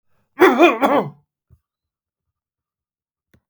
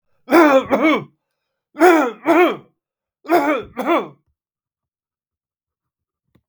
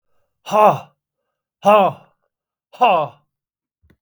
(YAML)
cough_length: 3.5 s
cough_amplitude: 32768
cough_signal_mean_std_ratio: 0.31
three_cough_length: 6.5 s
three_cough_amplitude: 32768
three_cough_signal_mean_std_ratio: 0.42
exhalation_length: 4.0 s
exhalation_amplitude: 32000
exhalation_signal_mean_std_ratio: 0.35
survey_phase: beta (2021-08-13 to 2022-03-07)
age: 65+
gender: Male
wearing_mask: 'No'
symptom_none: true
smoker_status: Ex-smoker
respiratory_condition_asthma: true
respiratory_condition_other: false
recruitment_source: REACT
submission_delay: 2 days
covid_test_result: Negative
covid_test_method: RT-qPCR
influenza_a_test_result: Negative
influenza_b_test_result: Negative